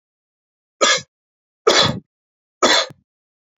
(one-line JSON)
{"three_cough_length": "3.6 s", "three_cough_amplitude": 30548, "three_cough_signal_mean_std_ratio": 0.35, "survey_phase": "beta (2021-08-13 to 2022-03-07)", "age": "45-64", "gender": "Male", "wearing_mask": "No", "symptom_none": true, "smoker_status": "Ex-smoker", "respiratory_condition_asthma": false, "respiratory_condition_other": false, "recruitment_source": "REACT", "submission_delay": "8 days", "covid_test_result": "Negative", "covid_test_method": "RT-qPCR", "influenza_a_test_result": "Negative", "influenza_b_test_result": "Negative"}